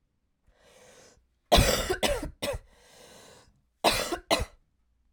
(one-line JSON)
{"cough_length": "5.1 s", "cough_amplitude": 15970, "cough_signal_mean_std_ratio": 0.38, "survey_phase": "alpha (2021-03-01 to 2021-08-12)", "age": "18-44", "gender": "Female", "wearing_mask": "No", "symptom_cough_any": true, "symptom_shortness_of_breath": true, "symptom_fatigue": true, "symptom_headache": true, "symptom_onset": "3 days", "smoker_status": "Never smoked", "respiratory_condition_asthma": true, "respiratory_condition_other": false, "recruitment_source": "Test and Trace", "submission_delay": "2 days", "covid_test_result": "Positive", "covid_test_method": "RT-qPCR"}